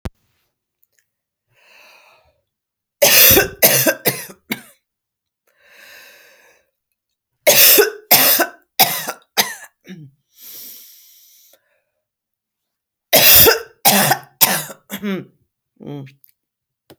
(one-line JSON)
{"three_cough_length": "17.0 s", "three_cough_amplitude": 32768, "three_cough_signal_mean_std_ratio": 0.35, "survey_phase": "beta (2021-08-13 to 2022-03-07)", "age": "45-64", "gender": "Female", "wearing_mask": "No", "symptom_cough_any": true, "symptom_runny_or_blocked_nose": true, "symptom_sore_throat": true, "symptom_diarrhoea": true, "symptom_fatigue": true, "symptom_headache": true, "symptom_change_to_sense_of_smell_or_taste": true, "smoker_status": "Ex-smoker", "respiratory_condition_asthma": false, "respiratory_condition_other": false, "recruitment_source": "Test and Trace", "submission_delay": "0 days", "covid_test_result": "Positive", "covid_test_method": "LFT"}